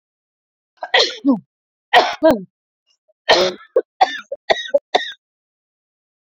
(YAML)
cough_length: 6.4 s
cough_amplitude: 30088
cough_signal_mean_std_ratio: 0.36
survey_phase: beta (2021-08-13 to 2022-03-07)
age: 18-44
gender: Female
wearing_mask: 'No'
symptom_none: true
smoker_status: Never smoked
respiratory_condition_asthma: false
respiratory_condition_other: false
recruitment_source: REACT
submission_delay: 4 days
covid_test_result: Negative
covid_test_method: RT-qPCR